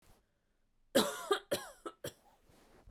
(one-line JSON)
{"three_cough_length": "2.9 s", "three_cough_amplitude": 5557, "three_cough_signal_mean_std_ratio": 0.32, "survey_phase": "beta (2021-08-13 to 2022-03-07)", "age": "18-44", "gender": "Female", "wearing_mask": "No", "symptom_none": true, "smoker_status": "Never smoked", "respiratory_condition_asthma": false, "respiratory_condition_other": false, "recruitment_source": "REACT", "submission_delay": "1 day", "covid_test_result": "Negative", "covid_test_method": "RT-qPCR"}